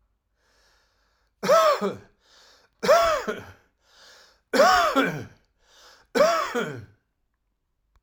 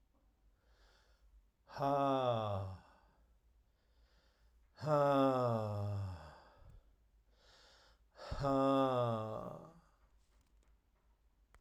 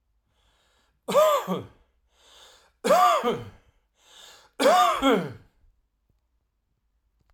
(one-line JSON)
{"cough_length": "8.0 s", "cough_amplitude": 18597, "cough_signal_mean_std_ratio": 0.42, "exhalation_length": "11.6 s", "exhalation_amplitude": 2994, "exhalation_signal_mean_std_ratio": 0.48, "three_cough_length": "7.3 s", "three_cough_amplitude": 12811, "three_cough_signal_mean_std_ratio": 0.4, "survey_phase": "alpha (2021-03-01 to 2021-08-12)", "age": "45-64", "gender": "Male", "wearing_mask": "Yes", "symptom_none": true, "smoker_status": "Ex-smoker", "respiratory_condition_asthma": false, "respiratory_condition_other": false, "recruitment_source": "REACT", "submission_delay": "2 days", "covid_test_result": "Negative", "covid_test_method": "RT-qPCR"}